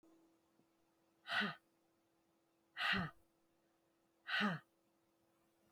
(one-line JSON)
{"exhalation_length": "5.7 s", "exhalation_amplitude": 1753, "exhalation_signal_mean_std_ratio": 0.33, "survey_phase": "beta (2021-08-13 to 2022-03-07)", "age": "45-64", "gender": "Female", "wearing_mask": "No", "symptom_none": true, "smoker_status": "Never smoked", "respiratory_condition_asthma": false, "respiratory_condition_other": false, "recruitment_source": "REACT", "submission_delay": "2 days", "covid_test_result": "Negative", "covid_test_method": "RT-qPCR"}